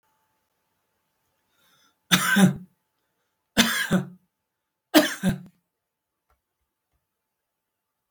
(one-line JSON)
{"three_cough_length": "8.1 s", "three_cough_amplitude": 27890, "three_cough_signal_mean_std_ratio": 0.29, "survey_phase": "beta (2021-08-13 to 2022-03-07)", "age": "65+", "gender": "Male", "wearing_mask": "No", "symptom_none": true, "smoker_status": "Ex-smoker", "respiratory_condition_asthma": false, "respiratory_condition_other": false, "recruitment_source": "REACT", "submission_delay": "1 day", "covid_test_result": "Negative", "covid_test_method": "RT-qPCR", "influenza_a_test_result": "Negative", "influenza_b_test_result": "Negative"}